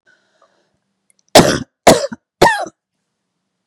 {
  "three_cough_length": "3.7 s",
  "three_cough_amplitude": 32768,
  "three_cough_signal_mean_std_ratio": 0.3,
  "survey_phase": "beta (2021-08-13 to 2022-03-07)",
  "age": "45-64",
  "gender": "Female",
  "wearing_mask": "No",
  "symptom_cough_any": true,
  "symptom_runny_or_blocked_nose": true,
  "symptom_other": true,
  "symptom_onset": "3 days",
  "smoker_status": "Never smoked",
  "respiratory_condition_asthma": false,
  "respiratory_condition_other": false,
  "recruitment_source": "Test and Trace",
  "submission_delay": "2 days",
  "covid_test_result": "Positive",
  "covid_test_method": "RT-qPCR",
  "covid_ct_value": 17.1,
  "covid_ct_gene": "ORF1ab gene",
  "covid_ct_mean": 17.5,
  "covid_viral_load": "1800000 copies/ml",
  "covid_viral_load_category": "High viral load (>1M copies/ml)"
}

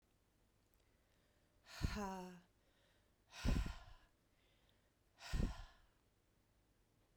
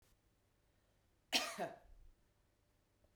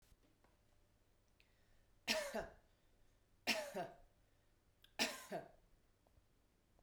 {
  "exhalation_length": "7.2 s",
  "exhalation_amplitude": 1619,
  "exhalation_signal_mean_std_ratio": 0.33,
  "cough_length": "3.2 s",
  "cough_amplitude": 4224,
  "cough_signal_mean_std_ratio": 0.28,
  "three_cough_length": "6.8 s",
  "three_cough_amplitude": 2430,
  "three_cough_signal_mean_std_ratio": 0.34,
  "survey_phase": "beta (2021-08-13 to 2022-03-07)",
  "age": "45-64",
  "gender": "Female",
  "wearing_mask": "No",
  "symptom_fatigue": true,
  "symptom_headache": true,
  "symptom_onset": "2 days",
  "smoker_status": "Never smoked",
  "respiratory_condition_asthma": false,
  "respiratory_condition_other": false,
  "recruitment_source": "Test and Trace",
  "submission_delay": "2 days",
  "covid_test_result": "Positive",
  "covid_test_method": "RT-qPCR",
  "covid_ct_value": 16.5,
  "covid_ct_gene": "ORF1ab gene",
  "covid_ct_mean": 16.9,
  "covid_viral_load": "2900000 copies/ml",
  "covid_viral_load_category": "High viral load (>1M copies/ml)"
}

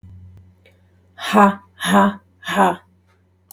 {
  "exhalation_length": "3.5 s",
  "exhalation_amplitude": 32616,
  "exhalation_signal_mean_std_ratio": 0.41,
  "survey_phase": "beta (2021-08-13 to 2022-03-07)",
  "age": "45-64",
  "gender": "Female",
  "wearing_mask": "No",
  "symptom_none": true,
  "smoker_status": "Never smoked",
  "respiratory_condition_asthma": false,
  "respiratory_condition_other": false,
  "recruitment_source": "REACT",
  "submission_delay": "1 day",
  "covid_test_result": "Negative",
  "covid_test_method": "RT-qPCR",
  "influenza_a_test_result": "Negative",
  "influenza_b_test_result": "Negative"
}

